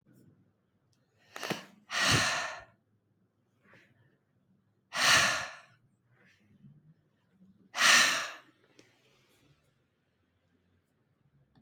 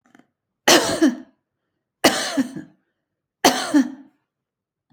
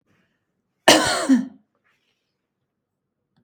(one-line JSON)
{"exhalation_length": "11.6 s", "exhalation_amplitude": 12403, "exhalation_signal_mean_std_ratio": 0.3, "three_cough_length": "4.9 s", "three_cough_amplitude": 32768, "three_cough_signal_mean_std_ratio": 0.37, "cough_length": "3.4 s", "cough_amplitude": 32767, "cough_signal_mean_std_ratio": 0.29, "survey_phase": "beta (2021-08-13 to 2022-03-07)", "age": "65+", "gender": "Female", "wearing_mask": "No", "symptom_none": true, "smoker_status": "Never smoked", "respiratory_condition_asthma": false, "respiratory_condition_other": false, "recruitment_source": "REACT", "submission_delay": "3 days", "covid_test_result": "Negative", "covid_test_method": "RT-qPCR", "influenza_a_test_result": "Negative", "influenza_b_test_result": "Negative"}